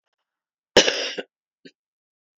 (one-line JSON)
{"cough_length": "2.4 s", "cough_amplitude": 31276, "cough_signal_mean_std_ratio": 0.24, "survey_phase": "beta (2021-08-13 to 2022-03-07)", "age": "45-64", "gender": "Female", "wearing_mask": "No", "symptom_sore_throat": true, "symptom_fatigue": true, "symptom_fever_high_temperature": true, "symptom_onset": "2 days", "smoker_status": "Never smoked", "respiratory_condition_asthma": false, "respiratory_condition_other": false, "recruitment_source": "Test and Trace", "submission_delay": "1 day", "covid_test_result": "Positive", "covid_test_method": "ePCR"}